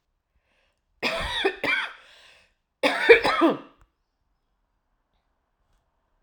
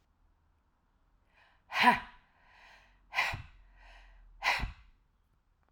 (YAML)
cough_length: 6.2 s
cough_amplitude: 28695
cough_signal_mean_std_ratio: 0.32
exhalation_length: 5.7 s
exhalation_amplitude: 9280
exhalation_signal_mean_std_ratio: 0.29
survey_phase: alpha (2021-03-01 to 2021-08-12)
age: 45-64
gender: Female
wearing_mask: 'No'
symptom_none: true
smoker_status: Ex-smoker
respiratory_condition_asthma: false
respiratory_condition_other: false
recruitment_source: REACT
submission_delay: 1 day
covid_test_result: Negative
covid_test_method: RT-qPCR